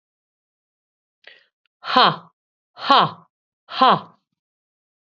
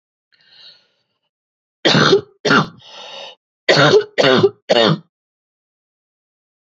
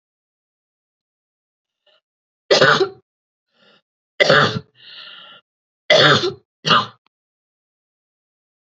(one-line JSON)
{"exhalation_length": "5.0 s", "exhalation_amplitude": 32767, "exhalation_signal_mean_std_ratio": 0.27, "cough_length": "6.7 s", "cough_amplitude": 31808, "cough_signal_mean_std_ratio": 0.4, "three_cough_length": "8.6 s", "three_cough_amplitude": 32309, "three_cough_signal_mean_std_ratio": 0.31, "survey_phase": "beta (2021-08-13 to 2022-03-07)", "age": "45-64", "gender": "Female", "wearing_mask": "No", "symptom_none": true, "smoker_status": "Ex-smoker", "respiratory_condition_asthma": true, "respiratory_condition_other": false, "recruitment_source": "REACT", "submission_delay": "1 day", "covid_test_result": "Negative", "covid_test_method": "RT-qPCR", "influenza_a_test_result": "Negative", "influenza_b_test_result": "Negative"}